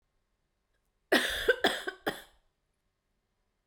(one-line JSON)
{"cough_length": "3.7 s", "cough_amplitude": 9382, "cough_signal_mean_std_ratio": 0.31, "survey_phase": "beta (2021-08-13 to 2022-03-07)", "age": "18-44", "gender": "Female", "wearing_mask": "No", "symptom_fatigue": true, "symptom_headache": true, "symptom_change_to_sense_of_smell_or_taste": true, "symptom_loss_of_taste": true, "symptom_other": true, "symptom_onset": "8 days", "smoker_status": "Never smoked", "respiratory_condition_asthma": false, "respiratory_condition_other": false, "recruitment_source": "Test and Trace", "submission_delay": "1 day", "covid_test_result": "Positive", "covid_test_method": "RT-qPCR", "covid_ct_value": 23.5, "covid_ct_gene": "ORF1ab gene"}